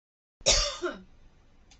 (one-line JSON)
{"cough_length": "1.8 s", "cough_amplitude": 13583, "cough_signal_mean_std_ratio": 0.39, "survey_phase": "beta (2021-08-13 to 2022-03-07)", "age": "18-44", "gender": "Female", "wearing_mask": "No", "symptom_none": true, "smoker_status": "Never smoked", "respiratory_condition_asthma": false, "respiratory_condition_other": false, "recruitment_source": "REACT", "submission_delay": "1 day", "covid_test_result": "Negative", "covid_test_method": "RT-qPCR"}